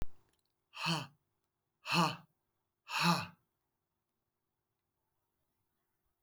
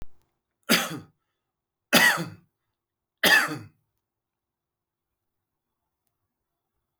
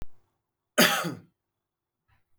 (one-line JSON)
{"exhalation_length": "6.2 s", "exhalation_amplitude": 5043, "exhalation_signal_mean_std_ratio": 0.31, "three_cough_length": "7.0 s", "three_cough_amplitude": 19431, "three_cough_signal_mean_std_ratio": 0.27, "cough_length": "2.4 s", "cough_amplitude": 16998, "cough_signal_mean_std_ratio": 0.31, "survey_phase": "beta (2021-08-13 to 2022-03-07)", "age": "45-64", "gender": "Male", "wearing_mask": "No", "symptom_none": true, "smoker_status": "Ex-smoker", "respiratory_condition_asthma": false, "respiratory_condition_other": false, "recruitment_source": "REACT", "submission_delay": "0 days", "covid_test_result": "Negative", "covid_test_method": "RT-qPCR"}